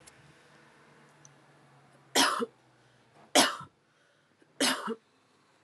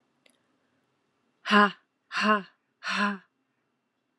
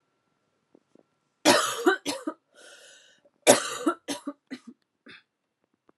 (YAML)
three_cough_length: 5.6 s
three_cough_amplitude: 14599
three_cough_signal_mean_std_ratio: 0.3
exhalation_length: 4.2 s
exhalation_amplitude: 16560
exhalation_signal_mean_std_ratio: 0.31
cough_length: 6.0 s
cough_amplitude: 27400
cough_signal_mean_std_ratio: 0.3
survey_phase: alpha (2021-03-01 to 2021-08-12)
age: 18-44
gender: Female
wearing_mask: 'No'
symptom_cough_any: true
symptom_fatigue: true
symptom_headache: true
smoker_status: Ex-smoker
respiratory_condition_asthma: false
respiratory_condition_other: false
recruitment_source: Test and Trace
submission_delay: 1 day
covid_test_result: Positive
covid_test_method: RT-qPCR
covid_ct_value: 37.0
covid_ct_gene: N gene